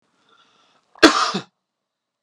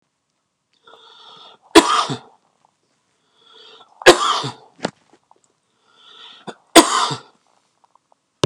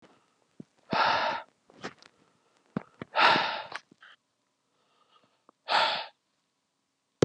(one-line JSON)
{"cough_length": "2.2 s", "cough_amplitude": 32768, "cough_signal_mean_std_ratio": 0.25, "three_cough_length": "8.5 s", "three_cough_amplitude": 32768, "three_cough_signal_mean_std_ratio": 0.25, "exhalation_length": "7.2 s", "exhalation_amplitude": 16058, "exhalation_signal_mean_std_ratio": 0.34, "survey_phase": "beta (2021-08-13 to 2022-03-07)", "age": "45-64", "gender": "Male", "wearing_mask": "No", "symptom_cough_any": true, "symptom_headache": true, "symptom_onset": "13 days", "smoker_status": "Never smoked", "respiratory_condition_asthma": false, "respiratory_condition_other": false, "recruitment_source": "REACT", "submission_delay": "2 days", "covid_test_result": "Negative", "covid_test_method": "RT-qPCR", "influenza_a_test_result": "Negative", "influenza_b_test_result": "Negative"}